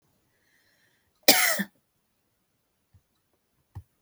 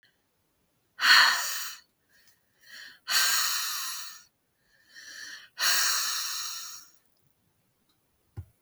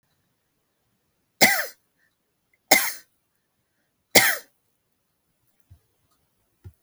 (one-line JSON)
{"cough_length": "4.0 s", "cough_amplitude": 32768, "cough_signal_mean_std_ratio": 0.21, "exhalation_length": "8.6 s", "exhalation_amplitude": 18848, "exhalation_signal_mean_std_ratio": 0.43, "three_cough_length": "6.8 s", "three_cough_amplitude": 32768, "three_cough_signal_mean_std_ratio": 0.22, "survey_phase": "beta (2021-08-13 to 2022-03-07)", "age": "45-64", "gender": "Female", "wearing_mask": "No", "symptom_none": true, "smoker_status": "Never smoked", "respiratory_condition_asthma": true, "respiratory_condition_other": false, "recruitment_source": "REACT", "submission_delay": "16 days", "covid_test_result": "Negative", "covid_test_method": "RT-qPCR", "influenza_a_test_result": "Negative", "influenza_b_test_result": "Negative"}